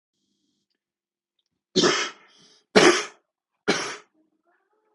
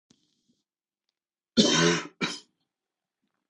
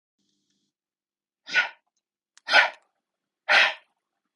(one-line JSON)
{"three_cough_length": "4.9 s", "three_cough_amplitude": 27164, "three_cough_signal_mean_std_ratio": 0.29, "cough_length": "3.5 s", "cough_amplitude": 19119, "cough_signal_mean_std_ratio": 0.31, "exhalation_length": "4.4 s", "exhalation_amplitude": 23315, "exhalation_signal_mean_std_ratio": 0.28, "survey_phase": "beta (2021-08-13 to 2022-03-07)", "age": "45-64", "gender": "Male", "wearing_mask": "No", "symptom_none": true, "smoker_status": "Ex-smoker", "respiratory_condition_asthma": false, "respiratory_condition_other": false, "recruitment_source": "Test and Trace", "submission_delay": "-1 day", "covid_test_result": "Negative", "covid_test_method": "LFT"}